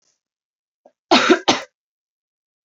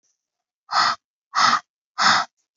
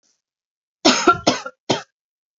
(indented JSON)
{
  "cough_length": "2.6 s",
  "cough_amplitude": 29944,
  "cough_signal_mean_std_ratio": 0.28,
  "exhalation_length": "2.6 s",
  "exhalation_amplitude": 20218,
  "exhalation_signal_mean_std_ratio": 0.44,
  "three_cough_length": "2.4 s",
  "three_cough_amplitude": 29290,
  "three_cough_signal_mean_std_ratio": 0.35,
  "survey_phase": "beta (2021-08-13 to 2022-03-07)",
  "age": "18-44",
  "gender": "Female",
  "wearing_mask": "No",
  "symptom_runny_or_blocked_nose": true,
  "symptom_sore_throat": true,
  "symptom_headache": true,
  "symptom_onset": "13 days",
  "smoker_status": "Ex-smoker",
  "respiratory_condition_asthma": true,
  "respiratory_condition_other": false,
  "recruitment_source": "REACT",
  "submission_delay": "2 days",
  "covid_test_result": "Negative",
  "covid_test_method": "RT-qPCR",
  "influenza_a_test_result": "Negative",
  "influenza_b_test_result": "Negative"
}